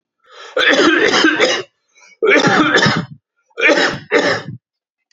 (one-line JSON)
{"cough_length": "5.1 s", "cough_amplitude": 32767, "cough_signal_mean_std_ratio": 0.65, "survey_phase": "beta (2021-08-13 to 2022-03-07)", "age": "45-64", "gender": "Male", "wearing_mask": "No", "symptom_fatigue": true, "smoker_status": "Never smoked", "respiratory_condition_asthma": false, "respiratory_condition_other": false, "recruitment_source": "REACT", "submission_delay": "2 days", "covid_test_result": "Negative", "covid_test_method": "RT-qPCR", "influenza_a_test_result": "Negative", "influenza_b_test_result": "Negative"}